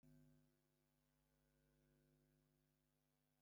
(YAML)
exhalation_length: 3.4 s
exhalation_amplitude: 29
exhalation_signal_mean_std_ratio: 0.72
survey_phase: beta (2021-08-13 to 2022-03-07)
age: 65+
gender: Male
wearing_mask: 'No'
symptom_none: true
smoker_status: Ex-smoker
respiratory_condition_asthma: false
respiratory_condition_other: false
recruitment_source: REACT
submission_delay: 2 days
covid_test_result: Negative
covid_test_method: RT-qPCR
influenza_a_test_result: Negative
influenza_b_test_result: Negative